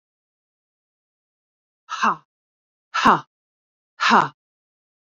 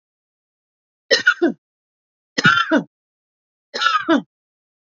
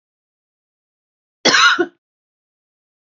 {"exhalation_length": "5.1 s", "exhalation_amplitude": 27181, "exhalation_signal_mean_std_ratio": 0.27, "three_cough_length": "4.9 s", "three_cough_amplitude": 28852, "three_cough_signal_mean_std_ratio": 0.37, "cough_length": "3.2 s", "cough_amplitude": 32768, "cough_signal_mean_std_ratio": 0.28, "survey_phase": "beta (2021-08-13 to 2022-03-07)", "age": "45-64", "gender": "Female", "wearing_mask": "No", "symptom_none": true, "smoker_status": "Ex-smoker", "respiratory_condition_asthma": false, "respiratory_condition_other": false, "recruitment_source": "REACT", "submission_delay": "2 days", "covid_test_result": "Negative", "covid_test_method": "RT-qPCR", "influenza_a_test_result": "Negative", "influenza_b_test_result": "Negative"}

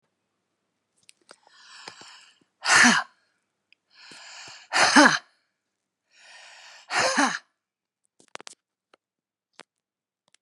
{"exhalation_length": "10.4 s", "exhalation_amplitude": 28115, "exhalation_signal_mean_std_ratio": 0.27, "survey_phase": "beta (2021-08-13 to 2022-03-07)", "age": "65+", "gender": "Female", "wearing_mask": "No", "symptom_runny_or_blocked_nose": true, "symptom_onset": "9 days", "smoker_status": "Ex-smoker", "respiratory_condition_asthma": false, "respiratory_condition_other": false, "recruitment_source": "REACT", "submission_delay": "1 day", "covid_test_result": "Negative", "covid_test_method": "RT-qPCR", "influenza_a_test_result": "Negative", "influenza_b_test_result": "Negative"}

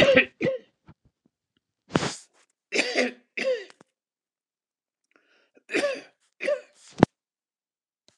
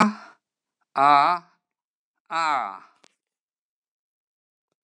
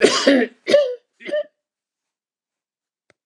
{"three_cough_length": "8.2 s", "three_cough_amplitude": 29204, "three_cough_signal_mean_std_ratio": 0.31, "exhalation_length": "4.8 s", "exhalation_amplitude": 19512, "exhalation_signal_mean_std_ratio": 0.3, "cough_length": "3.3 s", "cough_amplitude": 29203, "cough_signal_mean_std_ratio": 0.4, "survey_phase": "beta (2021-08-13 to 2022-03-07)", "age": "65+", "gender": "Male", "wearing_mask": "No", "symptom_none": true, "smoker_status": "Never smoked", "respiratory_condition_asthma": false, "respiratory_condition_other": false, "recruitment_source": "REACT", "submission_delay": "2 days", "covid_test_result": "Negative", "covid_test_method": "RT-qPCR"}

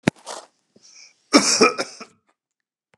{"cough_length": "3.0 s", "cough_amplitude": 32741, "cough_signal_mean_std_ratio": 0.3, "survey_phase": "beta (2021-08-13 to 2022-03-07)", "age": "45-64", "gender": "Male", "wearing_mask": "No", "symptom_none": true, "smoker_status": "Never smoked", "respiratory_condition_asthma": false, "respiratory_condition_other": false, "recruitment_source": "REACT", "submission_delay": "11 days", "covid_test_result": "Negative", "covid_test_method": "RT-qPCR", "influenza_a_test_result": "Negative", "influenza_b_test_result": "Negative"}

